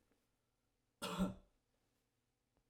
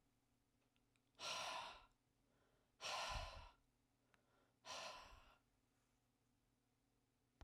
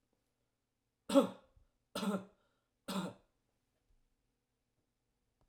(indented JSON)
{
  "cough_length": "2.7 s",
  "cough_amplitude": 1341,
  "cough_signal_mean_std_ratio": 0.27,
  "exhalation_length": "7.4 s",
  "exhalation_amplitude": 546,
  "exhalation_signal_mean_std_ratio": 0.42,
  "three_cough_length": "5.5 s",
  "three_cough_amplitude": 5691,
  "three_cough_signal_mean_std_ratio": 0.23,
  "survey_phase": "beta (2021-08-13 to 2022-03-07)",
  "age": "45-64",
  "gender": "Male",
  "wearing_mask": "No",
  "symptom_none": true,
  "smoker_status": "Never smoked",
  "respiratory_condition_asthma": false,
  "respiratory_condition_other": false,
  "recruitment_source": "REACT",
  "submission_delay": "1 day",
  "covid_test_result": "Negative",
  "covid_test_method": "RT-qPCR",
  "influenza_a_test_result": "Negative",
  "influenza_b_test_result": "Negative"
}